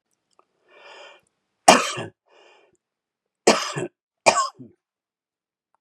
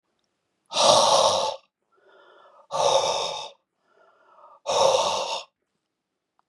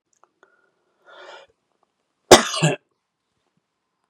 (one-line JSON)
{"three_cough_length": "5.8 s", "three_cough_amplitude": 32768, "three_cough_signal_mean_std_ratio": 0.25, "exhalation_length": "6.5 s", "exhalation_amplitude": 27448, "exhalation_signal_mean_std_ratio": 0.47, "cough_length": "4.1 s", "cough_amplitude": 32768, "cough_signal_mean_std_ratio": 0.18, "survey_phase": "beta (2021-08-13 to 2022-03-07)", "age": "45-64", "gender": "Male", "wearing_mask": "No", "symptom_none": true, "symptom_onset": "3 days", "smoker_status": "Never smoked", "respiratory_condition_asthma": false, "respiratory_condition_other": false, "recruitment_source": "Test and Trace", "submission_delay": "1 day", "covid_test_result": "Negative", "covid_test_method": "RT-qPCR"}